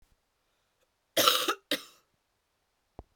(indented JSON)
{
  "cough_length": "3.2 s",
  "cough_amplitude": 18636,
  "cough_signal_mean_std_ratio": 0.28,
  "survey_phase": "beta (2021-08-13 to 2022-03-07)",
  "age": "18-44",
  "gender": "Female",
  "wearing_mask": "No",
  "symptom_sore_throat": true,
  "smoker_status": "Never smoked",
  "respiratory_condition_asthma": false,
  "respiratory_condition_other": false,
  "recruitment_source": "Test and Trace",
  "submission_delay": "2 days",
  "covid_test_result": "Positive",
  "covid_test_method": "ePCR"
}